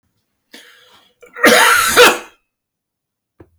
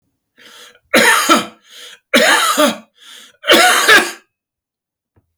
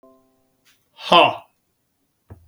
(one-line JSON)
{"cough_length": "3.6 s", "cough_amplitude": 32768, "cough_signal_mean_std_ratio": 0.38, "three_cough_length": "5.4 s", "three_cough_amplitude": 32768, "three_cough_signal_mean_std_ratio": 0.49, "exhalation_length": "2.5 s", "exhalation_amplitude": 32766, "exhalation_signal_mean_std_ratio": 0.24, "survey_phase": "beta (2021-08-13 to 2022-03-07)", "age": "45-64", "gender": "Male", "wearing_mask": "No", "symptom_none": true, "smoker_status": "Ex-smoker", "respiratory_condition_asthma": false, "respiratory_condition_other": false, "recruitment_source": "REACT", "submission_delay": "1 day", "covid_test_result": "Negative", "covid_test_method": "RT-qPCR", "influenza_a_test_result": "Negative", "influenza_b_test_result": "Negative"}